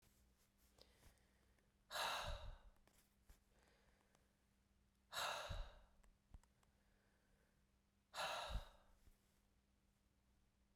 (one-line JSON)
{"exhalation_length": "10.8 s", "exhalation_amplitude": 819, "exhalation_signal_mean_std_ratio": 0.38, "survey_phase": "beta (2021-08-13 to 2022-03-07)", "age": "45-64", "gender": "Female", "wearing_mask": "No", "symptom_none": true, "smoker_status": "Never smoked", "respiratory_condition_asthma": false, "respiratory_condition_other": false, "recruitment_source": "REACT", "submission_delay": "9 days", "covid_test_result": "Negative", "covid_test_method": "RT-qPCR"}